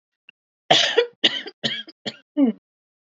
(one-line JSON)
{"cough_length": "3.1 s", "cough_amplitude": 29194, "cough_signal_mean_std_ratio": 0.4, "survey_phase": "beta (2021-08-13 to 2022-03-07)", "age": "18-44", "gender": "Female", "wearing_mask": "No", "symptom_fatigue": true, "symptom_onset": "3 days", "smoker_status": "Never smoked", "respiratory_condition_asthma": false, "respiratory_condition_other": false, "recruitment_source": "REACT", "submission_delay": "1 day", "covid_test_result": "Negative", "covid_test_method": "RT-qPCR", "influenza_a_test_result": "Negative", "influenza_b_test_result": "Negative"}